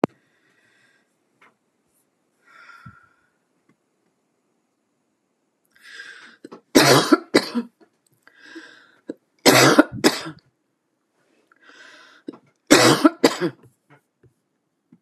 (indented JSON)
{
  "three_cough_length": "15.0 s",
  "three_cough_amplitude": 32768,
  "three_cough_signal_mean_std_ratio": 0.26,
  "survey_phase": "beta (2021-08-13 to 2022-03-07)",
  "age": "65+",
  "gender": "Female",
  "wearing_mask": "No",
  "symptom_none": true,
  "smoker_status": "Ex-smoker",
  "respiratory_condition_asthma": false,
  "respiratory_condition_other": false,
  "recruitment_source": "REACT",
  "submission_delay": "2 days",
  "covid_test_result": "Negative",
  "covid_test_method": "RT-qPCR"
}